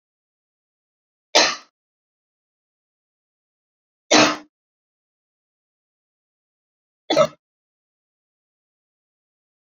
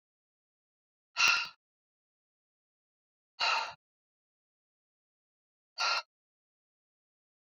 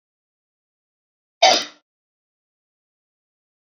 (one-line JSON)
{"three_cough_length": "9.6 s", "three_cough_amplitude": 32767, "three_cough_signal_mean_std_ratio": 0.19, "exhalation_length": "7.6 s", "exhalation_amplitude": 6555, "exhalation_signal_mean_std_ratio": 0.25, "cough_length": "3.8 s", "cough_amplitude": 28255, "cough_signal_mean_std_ratio": 0.18, "survey_phase": "beta (2021-08-13 to 2022-03-07)", "age": "45-64", "gender": "Female", "wearing_mask": "No", "symptom_none": true, "smoker_status": "Ex-smoker", "respiratory_condition_asthma": false, "respiratory_condition_other": false, "recruitment_source": "REACT", "submission_delay": "1 day", "covid_test_result": "Negative", "covid_test_method": "RT-qPCR"}